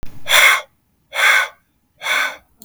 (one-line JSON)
{"exhalation_length": "2.6 s", "exhalation_amplitude": 32766, "exhalation_signal_mean_std_ratio": 0.54, "survey_phase": "beta (2021-08-13 to 2022-03-07)", "age": "18-44", "gender": "Male", "wearing_mask": "No", "symptom_none": true, "smoker_status": "Never smoked", "respiratory_condition_asthma": false, "respiratory_condition_other": false, "recruitment_source": "REACT", "submission_delay": "1 day", "covid_test_result": "Negative", "covid_test_method": "RT-qPCR", "influenza_a_test_result": "Negative", "influenza_b_test_result": "Negative"}